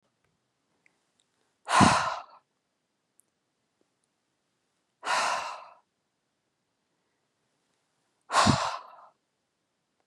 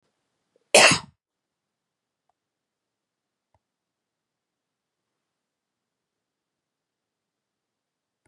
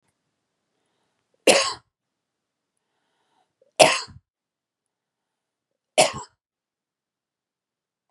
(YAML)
exhalation_length: 10.1 s
exhalation_amplitude: 19115
exhalation_signal_mean_std_ratio: 0.27
cough_length: 8.3 s
cough_amplitude: 29318
cough_signal_mean_std_ratio: 0.13
three_cough_length: 8.1 s
three_cough_amplitude: 32768
three_cough_signal_mean_std_ratio: 0.19
survey_phase: beta (2021-08-13 to 2022-03-07)
age: 65+
gender: Female
wearing_mask: 'No'
symptom_none: true
symptom_onset: 6 days
smoker_status: Ex-smoker
respiratory_condition_asthma: false
respiratory_condition_other: false
recruitment_source: REACT
submission_delay: 2 days
covid_test_result: Negative
covid_test_method: RT-qPCR
influenza_a_test_result: Negative
influenza_b_test_result: Negative